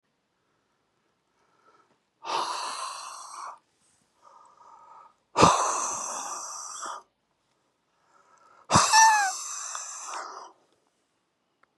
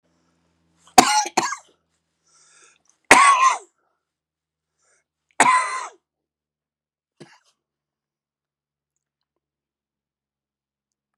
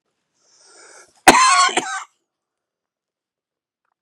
exhalation_length: 11.8 s
exhalation_amplitude: 24411
exhalation_signal_mean_std_ratio: 0.36
three_cough_length: 11.2 s
three_cough_amplitude: 32768
three_cough_signal_mean_std_ratio: 0.24
cough_length: 4.0 s
cough_amplitude: 32768
cough_signal_mean_std_ratio: 0.29
survey_phase: beta (2021-08-13 to 2022-03-07)
age: 65+
gender: Male
wearing_mask: 'No'
symptom_cough_any: true
symptom_runny_or_blocked_nose: true
smoker_status: Never smoked
respiratory_condition_asthma: true
respiratory_condition_other: false
recruitment_source: REACT
submission_delay: 0 days
covid_test_result: Negative
covid_test_method: RT-qPCR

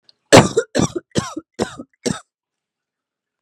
cough_length: 3.4 s
cough_amplitude: 32768
cough_signal_mean_std_ratio: 0.29
survey_phase: beta (2021-08-13 to 2022-03-07)
age: 18-44
gender: Female
wearing_mask: 'No'
symptom_fatigue: true
symptom_headache: true
symptom_onset: 12 days
smoker_status: Ex-smoker
respiratory_condition_asthma: false
respiratory_condition_other: false
recruitment_source: REACT
submission_delay: 1 day
covid_test_result: Negative
covid_test_method: RT-qPCR
influenza_a_test_result: Negative
influenza_b_test_result: Negative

